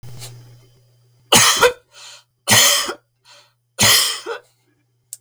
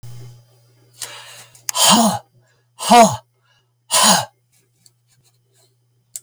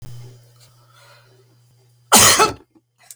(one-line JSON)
{"three_cough_length": "5.2 s", "three_cough_amplitude": 32768, "three_cough_signal_mean_std_ratio": 0.42, "exhalation_length": "6.2 s", "exhalation_amplitude": 32768, "exhalation_signal_mean_std_ratio": 0.34, "cough_length": "3.2 s", "cough_amplitude": 32768, "cough_signal_mean_std_ratio": 0.32, "survey_phase": "beta (2021-08-13 to 2022-03-07)", "age": "65+", "gender": "Male", "wearing_mask": "No", "symptom_cough_any": true, "symptom_runny_or_blocked_nose": true, "symptom_sore_throat": true, "symptom_headache": true, "symptom_change_to_sense_of_smell_or_taste": true, "symptom_loss_of_taste": true, "smoker_status": "Ex-smoker", "respiratory_condition_asthma": false, "respiratory_condition_other": false, "recruitment_source": "Test and Trace", "submission_delay": "1 day", "covid_test_result": "Positive", "covid_test_method": "ePCR"}